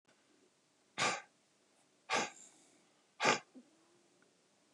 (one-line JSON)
{"exhalation_length": "4.7 s", "exhalation_amplitude": 7460, "exhalation_signal_mean_std_ratio": 0.29, "survey_phase": "beta (2021-08-13 to 2022-03-07)", "age": "45-64", "gender": "Male", "wearing_mask": "No", "symptom_runny_or_blocked_nose": true, "smoker_status": "Current smoker (11 or more cigarettes per day)", "respiratory_condition_asthma": false, "respiratory_condition_other": false, "recruitment_source": "Test and Trace", "submission_delay": "1 day", "covid_test_result": "Positive", "covid_test_method": "LFT"}